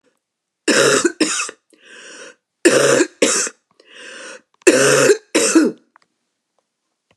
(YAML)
three_cough_length: 7.2 s
three_cough_amplitude: 32768
three_cough_signal_mean_std_ratio: 0.47
survey_phase: beta (2021-08-13 to 2022-03-07)
age: 65+
gender: Female
wearing_mask: 'No'
symptom_cough_any: true
symptom_runny_or_blocked_nose: true
symptom_onset: 6 days
smoker_status: Never smoked
respiratory_condition_asthma: false
respiratory_condition_other: false
recruitment_source: REACT
submission_delay: 1 day
covid_test_result: Negative
covid_test_method: RT-qPCR
influenza_a_test_result: Negative
influenza_b_test_result: Negative